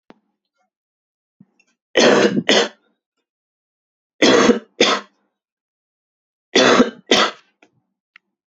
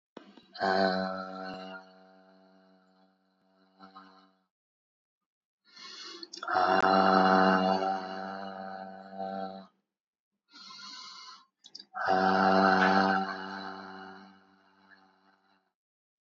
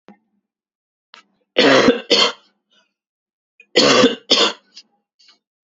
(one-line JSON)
{"three_cough_length": "8.5 s", "three_cough_amplitude": 32768, "three_cough_signal_mean_std_ratio": 0.36, "exhalation_length": "16.4 s", "exhalation_amplitude": 10956, "exhalation_signal_mean_std_ratio": 0.45, "cough_length": "5.7 s", "cough_amplitude": 31013, "cough_signal_mean_std_ratio": 0.38, "survey_phase": "beta (2021-08-13 to 2022-03-07)", "age": "18-44", "gender": "Male", "wearing_mask": "No", "symptom_none": true, "smoker_status": "Current smoker (1 to 10 cigarettes per day)", "respiratory_condition_asthma": false, "respiratory_condition_other": false, "recruitment_source": "REACT", "submission_delay": "1 day", "covid_test_result": "Negative", "covid_test_method": "RT-qPCR", "influenza_a_test_result": "Negative", "influenza_b_test_result": "Negative"}